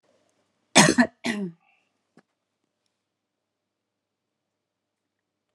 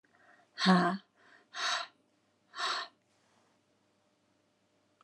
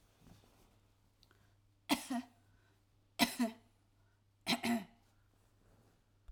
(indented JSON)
{
  "cough_length": "5.5 s",
  "cough_amplitude": 30279,
  "cough_signal_mean_std_ratio": 0.2,
  "exhalation_length": "5.0 s",
  "exhalation_amplitude": 8788,
  "exhalation_signal_mean_std_ratio": 0.31,
  "three_cough_length": "6.3 s",
  "three_cough_amplitude": 6332,
  "three_cough_signal_mean_std_ratio": 0.29,
  "survey_phase": "alpha (2021-03-01 to 2021-08-12)",
  "age": "65+",
  "gender": "Female",
  "wearing_mask": "No",
  "symptom_none": true,
  "smoker_status": "Never smoked",
  "respiratory_condition_asthma": false,
  "respiratory_condition_other": false,
  "recruitment_source": "REACT",
  "submission_delay": "3 days",
  "covid_test_result": "Negative",
  "covid_test_method": "RT-qPCR"
}